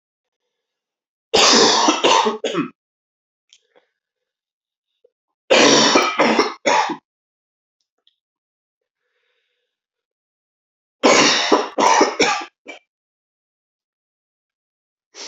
three_cough_length: 15.3 s
three_cough_amplitude: 32767
three_cough_signal_mean_std_ratio: 0.39
survey_phase: beta (2021-08-13 to 2022-03-07)
age: 18-44
gender: Male
wearing_mask: 'No'
symptom_cough_any: true
symptom_runny_or_blocked_nose: true
symptom_fatigue: true
symptom_fever_high_temperature: true
symptom_headache: true
symptom_change_to_sense_of_smell_or_taste: true
smoker_status: Never smoked
respiratory_condition_asthma: false
respiratory_condition_other: false
recruitment_source: Test and Trace
submission_delay: 2 days
covid_test_result: Positive
covid_test_method: RT-qPCR
covid_ct_value: 14.5
covid_ct_gene: N gene
covid_ct_mean: 14.7
covid_viral_load: 15000000 copies/ml
covid_viral_load_category: High viral load (>1M copies/ml)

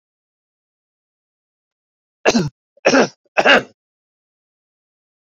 three_cough_length: 5.3 s
three_cough_amplitude: 28299
three_cough_signal_mean_std_ratio: 0.26
survey_phase: beta (2021-08-13 to 2022-03-07)
age: 65+
gender: Male
wearing_mask: 'No'
symptom_none: true
smoker_status: Current smoker (e-cigarettes or vapes only)
respiratory_condition_asthma: false
respiratory_condition_other: false
recruitment_source: REACT
submission_delay: 2 days
covid_test_result: Negative
covid_test_method: RT-qPCR
influenza_a_test_result: Unknown/Void
influenza_b_test_result: Unknown/Void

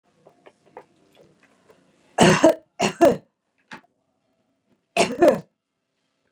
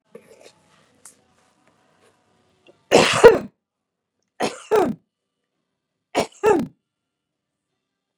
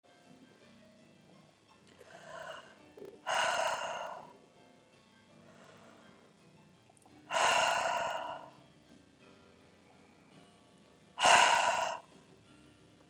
cough_length: 6.3 s
cough_amplitude: 28099
cough_signal_mean_std_ratio: 0.29
three_cough_length: 8.2 s
three_cough_amplitude: 32768
three_cough_signal_mean_std_ratio: 0.25
exhalation_length: 13.1 s
exhalation_amplitude: 10174
exhalation_signal_mean_std_ratio: 0.37
survey_phase: beta (2021-08-13 to 2022-03-07)
age: 65+
gender: Female
wearing_mask: 'No'
symptom_abdominal_pain: true
symptom_fatigue: true
symptom_onset: 12 days
smoker_status: Ex-smoker
respiratory_condition_asthma: false
respiratory_condition_other: true
recruitment_source: REACT
submission_delay: 1 day
covid_test_result: Negative
covid_test_method: RT-qPCR
influenza_a_test_result: Negative
influenza_b_test_result: Negative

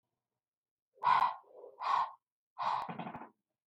exhalation_length: 3.7 s
exhalation_amplitude: 4709
exhalation_signal_mean_std_ratio: 0.42
survey_phase: beta (2021-08-13 to 2022-03-07)
age: 65+
gender: Female
wearing_mask: 'No'
symptom_none: true
smoker_status: Never smoked
respiratory_condition_asthma: false
respiratory_condition_other: false
recruitment_source: REACT
submission_delay: 1 day
covid_test_result: Negative
covid_test_method: RT-qPCR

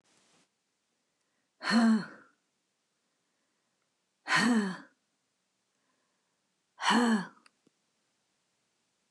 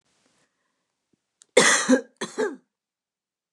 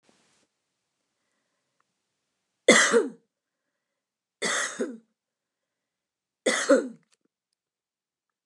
exhalation_length: 9.1 s
exhalation_amplitude: 7483
exhalation_signal_mean_std_ratio: 0.32
cough_length: 3.5 s
cough_amplitude: 27388
cough_signal_mean_std_ratio: 0.31
three_cough_length: 8.5 s
three_cough_amplitude: 24941
three_cough_signal_mean_std_ratio: 0.26
survey_phase: beta (2021-08-13 to 2022-03-07)
age: 45-64
gender: Female
wearing_mask: 'No'
symptom_cough_any: true
symptom_runny_or_blocked_nose: true
symptom_shortness_of_breath: true
symptom_sore_throat: true
symptom_headache: true
symptom_onset: 5 days
smoker_status: Never smoked
respiratory_condition_asthma: false
respiratory_condition_other: false
recruitment_source: Test and Trace
submission_delay: 2 days
covid_test_method: RT-qPCR
covid_ct_value: 32.1
covid_ct_gene: ORF1ab gene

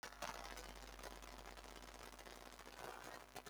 cough_length: 3.5 s
cough_amplitude: 1054
cough_signal_mean_std_ratio: 0.83
survey_phase: beta (2021-08-13 to 2022-03-07)
age: 65+
gender: Female
wearing_mask: 'No'
symptom_runny_or_blocked_nose: true
symptom_sore_throat: true
symptom_headache: true
smoker_status: Never smoked
recruitment_source: Test and Trace
submission_delay: 3 days
covid_test_result: Positive
covid_test_method: RT-qPCR
covid_ct_value: 21.6
covid_ct_gene: ORF1ab gene
covid_ct_mean: 21.9
covid_viral_load: 65000 copies/ml
covid_viral_load_category: Low viral load (10K-1M copies/ml)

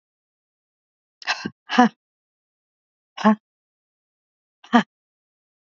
exhalation_length: 5.7 s
exhalation_amplitude: 24727
exhalation_signal_mean_std_ratio: 0.21
survey_phase: beta (2021-08-13 to 2022-03-07)
age: 65+
gender: Female
wearing_mask: 'No'
symptom_none: true
smoker_status: Never smoked
respiratory_condition_asthma: false
respiratory_condition_other: false
recruitment_source: REACT
submission_delay: 2 days
covid_test_result: Negative
covid_test_method: RT-qPCR
influenza_a_test_result: Negative
influenza_b_test_result: Negative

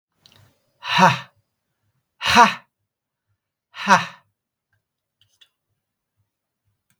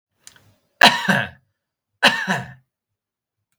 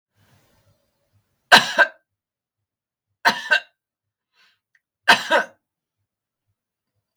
exhalation_length: 7.0 s
exhalation_amplitude: 32768
exhalation_signal_mean_std_ratio: 0.24
cough_length: 3.6 s
cough_amplitude: 32768
cough_signal_mean_std_ratio: 0.31
three_cough_length: 7.2 s
three_cough_amplitude: 32768
three_cough_signal_mean_std_ratio: 0.23
survey_phase: beta (2021-08-13 to 2022-03-07)
age: 65+
gender: Male
wearing_mask: 'No'
symptom_none: true
smoker_status: Never smoked
respiratory_condition_asthma: false
respiratory_condition_other: false
recruitment_source: REACT
submission_delay: 1 day
covid_test_result: Negative
covid_test_method: RT-qPCR
influenza_a_test_result: Negative
influenza_b_test_result: Negative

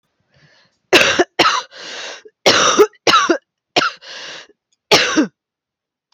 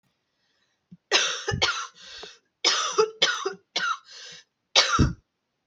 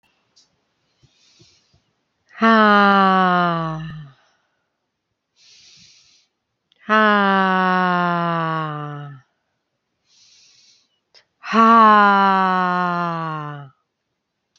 cough_length: 6.1 s
cough_amplitude: 32500
cough_signal_mean_std_ratio: 0.45
three_cough_length: 5.7 s
three_cough_amplitude: 21914
three_cough_signal_mean_std_ratio: 0.46
exhalation_length: 14.6 s
exhalation_amplitude: 28163
exhalation_signal_mean_std_ratio: 0.45
survey_phase: alpha (2021-03-01 to 2021-08-12)
age: 45-64
gender: Female
wearing_mask: 'No'
symptom_cough_any: true
symptom_fatigue: true
symptom_headache: true
smoker_status: Current smoker (1 to 10 cigarettes per day)
respiratory_condition_asthma: false
respiratory_condition_other: false
recruitment_source: Test and Trace
submission_delay: 2 days
covid_test_result: Positive
covid_test_method: RT-qPCR
covid_ct_value: 19.6
covid_ct_gene: N gene
covid_ct_mean: 20.4
covid_viral_load: 210000 copies/ml
covid_viral_load_category: Low viral load (10K-1M copies/ml)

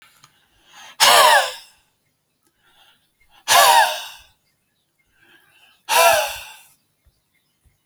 exhalation_length: 7.9 s
exhalation_amplitude: 32322
exhalation_signal_mean_std_ratio: 0.35
survey_phase: beta (2021-08-13 to 2022-03-07)
age: 18-44
gender: Male
wearing_mask: 'No'
symptom_none: true
smoker_status: Never smoked
respiratory_condition_asthma: false
respiratory_condition_other: false
recruitment_source: REACT
submission_delay: 1 day
covid_test_result: Negative
covid_test_method: RT-qPCR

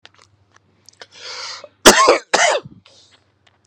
cough_length: 3.7 s
cough_amplitude: 32768
cough_signal_mean_std_ratio: 0.33
survey_phase: beta (2021-08-13 to 2022-03-07)
age: 45-64
gender: Male
wearing_mask: 'No'
symptom_none: true
symptom_onset: 12 days
smoker_status: Ex-smoker
respiratory_condition_asthma: false
respiratory_condition_other: false
recruitment_source: REACT
submission_delay: 1 day
covid_test_result: Negative
covid_test_method: RT-qPCR
influenza_a_test_result: Negative
influenza_b_test_result: Negative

